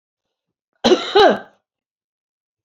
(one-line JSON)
{"cough_length": "2.6 s", "cough_amplitude": 28667, "cough_signal_mean_std_ratio": 0.31, "survey_phase": "beta (2021-08-13 to 2022-03-07)", "age": "45-64", "gender": "Female", "wearing_mask": "No", "symptom_none": true, "smoker_status": "Never smoked", "respiratory_condition_asthma": false, "respiratory_condition_other": false, "recruitment_source": "REACT", "submission_delay": "2 days", "covid_test_result": "Negative", "covid_test_method": "RT-qPCR", "influenza_a_test_result": "Negative", "influenza_b_test_result": "Negative"}